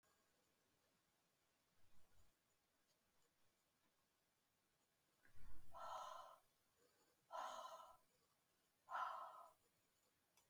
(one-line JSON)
{"exhalation_length": "10.5 s", "exhalation_amplitude": 488, "exhalation_signal_mean_std_ratio": 0.4, "survey_phase": "beta (2021-08-13 to 2022-03-07)", "age": "65+", "gender": "Female", "wearing_mask": "No", "symptom_none": true, "smoker_status": "Ex-smoker", "respiratory_condition_asthma": false, "respiratory_condition_other": false, "recruitment_source": "REACT", "submission_delay": "2 days", "covid_test_result": "Negative", "covid_test_method": "RT-qPCR", "influenza_a_test_result": "Negative", "influenza_b_test_result": "Negative"}